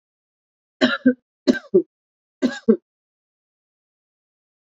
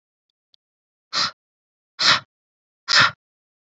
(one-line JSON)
{"three_cough_length": "4.8 s", "three_cough_amplitude": 26072, "three_cough_signal_mean_std_ratio": 0.25, "exhalation_length": "3.8 s", "exhalation_amplitude": 27226, "exhalation_signal_mean_std_ratio": 0.29, "survey_phase": "alpha (2021-03-01 to 2021-08-12)", "age": "45-64", "gender": "Female", "wearing_mask": "No", "symptom_none": true, "symptom_onset": "8 days", "smoker_status": "Never smoked", "respiratory_condition_asthma": false, "respiratory_condition_other": false, "recruitment_source": "REACT", "submission_delay": "2 days", "covid_test_result": "Negative", "covid_test_method": "RT-qPCR"}